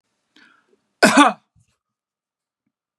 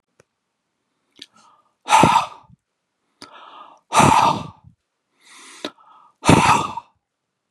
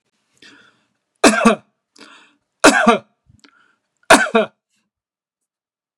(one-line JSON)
{"cough_length": "3.0 s", "cough_amplitude": 32767, "cough_signal_mean_std_ratio": 0.24, "exhalation_length": "7.5 s", "exhalation_amplitude": 32768, "exhalation_signal_mean_std_ratio": 0.34, "three_cough_length": "6.0 s", "three_cough_amplitude": 32768, "three_cough_signal_mean_std_ratio": 0.3, "survey_phase": "beta (2021-08-13 to 2022-03-07)", "age": "45-64", "gender": "Male", "wearing_mask": "No", "symptom_none": true, "smoker_status": "Ex-smoker", "respiratory_condition_asthma": true, "respiratory_condition_other": false, "recruitment_source": "REACT", "submission_delay": "1 day", "covid_test_result": "Negative", "covid_test_method": "RT-qPCR", "influenza_a_test_result": "Unknown/Void", "influenza_b_test_result": "Unknown/Void"}